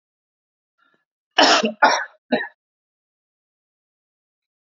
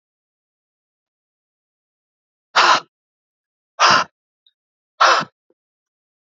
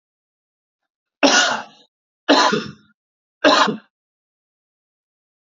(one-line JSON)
{"cough_length": "4.8 s", "cough_amplitude": 28696, "cough_signal_mean_std_ratio": 0.27, "exhalation_length": "6.4 s", "exhalation_amplitude": 30183, "exhalation_signal_mean_std_ratio": 0.26, "three_cough_length": "5.5 s", "three_cough_amplitude": 29009, "three_cough_signal_mean_std_ratio": 0.34, "survey_phase": "alpha (2021-03-01 to 2021-08-12)", "age": "18-44", "gender": "Male", "wearing_mask": "No", "symptom_fatigue": true, "symptom_onset": "5 days", "smoker_status": "Never smoked", "respiratory_condition_asthma": false, "respiratory_condition_other": false, "recruitment_source": "Test and Trace", "submission_delay": "2 days", "covid_test_result": "Positive", "covid_test_method": "RT-qPCR", "covid_ct_value": 18.1, "covid_ct_gene": "ORF1ab gene", "covid_ct_mean": 18.7, "covid_viral_load": "760000 copies/ml", "covid_viral_load_category": "Low viral load (10K-1M copies/ml)"}